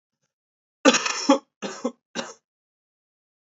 {"cough_length": "3.5 s", "cough_amplitude": 25733, "cough_signal_mean_std_ratio": 0.29, "survey_phase": "beta (2021-08-13 to 2022-03-07)", "age": "18-44", "gender": "Male", "wearing_mask": "No", "symptom_cough_any": true, "symptom_runny_or_blocked_nose": true, "symptom_sore_throat": true, "symptom_fatigue": true, "symptom_fever_high_temperature": true, "symptom_change_to_sense_of_smell_or_taste": true, "symptom_onset": "3 days", "smoker_status": "Ex-smoker", "respiratory_condition_asthma": false, "respiratory_condition_other": false, "recruitment_source": "Test and Trace", "submission_delay": "1 day", "covid_test_result": "Positive", "covid_test_method": "ePCR"}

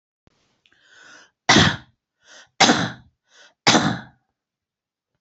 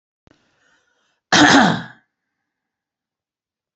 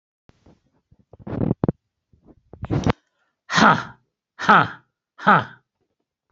{"three_cough_length": "5.2 s", "three_cough_amplitude": 31070, "three_cough_signal_mean_std_ratio": 0.31, "cough_length": "3.8 s", "cough_amplitude": 29838, "cough_signal_mean_std_ratio": 0.29, "exhalation_length": "6.3 s", "exhalation_amplitude": 28629, "exhalation_signal_mean_std_ratio": 0.31, "survey_phase": "beta (2021-08-13 to 2022-03-07)", "age": "45-64", "gender": "Male", "wearing_mask": "No", "symptom_none": true, "smoker_status": "Ex-smoker", "respiratory_condition_asthma": false, "respiratory_condition_other": false, "recruitment_source": "REACT", "submission_delay": "1 day", "covid_test_result": "Negative", "covid_test_method": "RT-qPCR"}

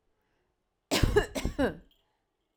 {"cough_length": "2.6 s", "cough_amplitude": 10244, "cough_signal_mean_std_ratio": 0.38, "survey_phase": "alpha (2021-03-01 to 2021-08-12)", "age": "45-64", "gender": "Female", "wearing_mask": "No", "symptom_none": true, "smoker_status": "Never smoked", "respiratory_condition_asthma": false, "respiratory_condition_other": false, "recruitment_source": "REACT", "submission_delay": "2 days", "covid_test_result": "Negative", "covid_test_method": "RT-qPCR"}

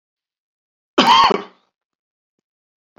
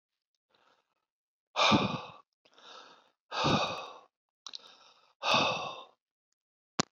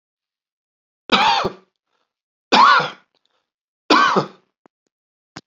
{"cough_length": "3.0 s", "cough_amplitude": 32768, "cough_signal_mean_std_ratio": 0.29, "exhalation_length": "6.9 s", "exhalation_amplitude": 11620, "exhalation_signal_mean_std_ratio": 0.36, "three_cough_length": "5.5 s", "three_cough_amplitude": 31167, "three_cough_signal_mean_std_ratio": 0.36, "survey_phase": "beta (2021-08-13 to 2022-03-07)", "age": "45-64", "gender": "Male", "wearing_mask": "No", "symptom_none": true, "smoker_status": "Never smoked", "respiratory_condition_asthma": false, "respiratory_condition_other": false, "recruitment_source": "REACT", "submission_delay": "3 days", "covid_test_result": "Negative", "covid_test_method": "RT-qPCR"}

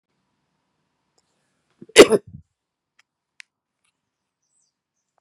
{"cough_length": "5.2 s", "cough_amplitude": 32768, "cough_signal_mean_std_ratio": 0.13, "survey_phase": "beta (2021-08-13 to 2022-03-07)", "age": "18-44", "gender": "Male", "wearing_mask": "No", "symptom_cough_any": true, "symptom_runny_or_blocked_nose": true, "symptom_sore_throat": true, "smoker_status": "Current smoker (e-cigarettes or vapes only)", "respiratory_condition_asthma": false, "respiratory_condition_other": false, "recruitment_source": "Test and Trace", "submission_delay": "0 days", "covid_test_result": "Positive", "covid_test_method": "LFT"}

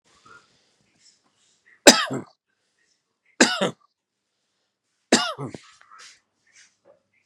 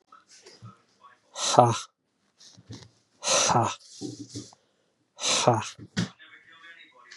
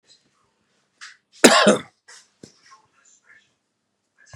{"three_cough_length": "7.3 s", "three_cough_amplitude": 32768, "three_cough_signal_mean_std_ratio": 0.21, "exhalation_length": "7.2 s", "exhalation_amplitude": 29582, "exhalation_signal_mean_std_ratio": 0.37, "cough_length": "4.4 s", "cough_amplitude": 32768, "cough_signal_mean_std_ratio": 0.22, "survey_phase": "beta (2021-08-13 to 2022-03-07)", "age": "45-64", "gender": "Female", "wearing_mask": "No", "symptom_runny_or_blocked_nose": true, "symptom_fatigue": true, "symptom_change_to_sense_of_smell_or_taste": true, "symptom_other": true, "symptom_onset": "6 days", "smoker_status": "Ex-smoker", "respiratory_condition_asthma": false, "respiratory_condition_other": false, "recruitment_source": "Test and Trace", "submission_delay": "2 days", "covid_test_result": "Positive", "covid_test_method": "RT-qPCR", "covid_ct_value": 15.5, "covid_ct_gene": "ORF1ab gene", "covid_ct_mean": 15.9, "covid_viral_load": "6000000 copies/ml", "covid_viral_load_category": "High viral load (>1M copies/ml)"}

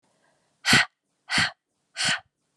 {"exhalation_length": "2.6 s", "exhalation_amplitude": 21157, "exhalation_signal_mean_std_ratio": 0.37, "survey_phase": "alpha (2021-03-01 to 2021-08-12)", "age": "18-44", "gender": "Female", "wearing_mask": "No", "symptom_prefer_not_to_say": true, "symptom_onset": "3 days", "smoker_status": "Never smoked", "respiratory_condition_asthma": false, "respiratory_condition_other": false, "recruitment_source": "Test and Trace", "submission_delay": "2 days", "covid_test_result": "Positive", "covid_test_method": "RT-qPCR", "covid_ct_value": 20.3, "covid_ct_gene": "ORF1ab gene", "covid_ct_mean": 21.1, "covid_viral_load": "120000 copies/ml", "covid_viral_load_category": "Low viral load (10K-1M copies/ml)"}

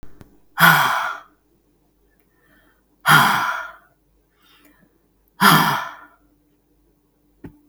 {"exhalation_length": "7.7 s", "exhalation_amplitude": 32768, "exhalation_signal_mean_std_ratio": 0.35, "survey_phase": "beta (2021-08-13 to 2022-03-07)", "age": "45-64", "gender": "Female", "wearing_mask": "No", "symptom_runny_or_blocked_nose": true, "symptom_sore_throat": true, "smoker_status": "Never smoked", "respiratory_condition_asthma": false, "respiratory_condition_other": false, "recruitment_source": "REACT", "submission_delay": "1 day", "covid_test_result": "Negative", "covid_test_method": "RT-qPCR", "influenza_a_test_result": "Negative", "influenza_b_test_result": "Negative"}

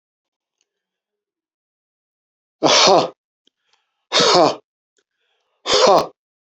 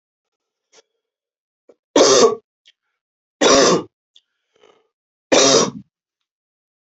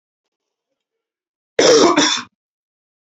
{"exhalation_length": "6.6 s", "exhalation_amplitude": 30413, "exhalation_signal_mean_std_ratio": 0.34, "three_cough_length": "7.0 s", "three_cough_amplitude": 29676, "three_cough_signal_mean_std_ratio": 0.34, "cough_length": "3.1 s", "cough_amplitude": 30617, "cough_signal_mean_std_ratio": 0.36, "survey_phase": "beta (2021-08-13 to 2022-03-07)", "age": "45-64", "gender": "Male", "wearing_mask": "No", "symptom_cough_any": true, "symptom_onset": "2 days", "smoker_status": "Never smoked", "respiratory_condition_asthma": false, "respiratory_condition_other": false, "recruitment_source": "Test and Trace", "submission_delay": "1 day", "covid_test_result": "Positive", "covid_test_method": "RT-qPCR", "covid_ct_value": 21.9, "covid_ct_gene": "ORF1ab gene", "covid_ct_mean": 22.5, "covid_viral_load": "43000 copies/ml", "covid_viral_load_category": "Low viral load (10K-1M copies/ml)"}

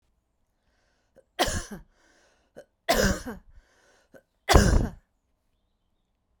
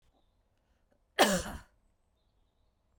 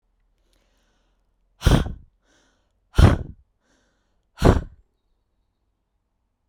{"three_cough_length": "6.4 s", "three_cough_amplitude": 29508, "three_cough_signal_mean_std_ratio": 0.3, "cough_length": "3.0 s", "cough_amplitude": 10327, "cough_signal_mean_std_ratio": 0.24, "exhalation_length": "6.5 s", "exhalation_amplitude": 32767, "exhalation_signal_mean_std_ratio": 0.24, "survey_phase": "beta (2021-08-13 to 2022-03-07)", "age": "45-64", "gender": "Female", "wearing_mask": "No", "symptom_none": true, "smoker_status": "Never smoked", "respiratory_condition_asthma": false, "respiratory_condition_other": false, "recruitment_source": "Test and Trace", "submission_delay": "1 day", "covid_test_result": "Positive", "covid_test_method": "ePCR"}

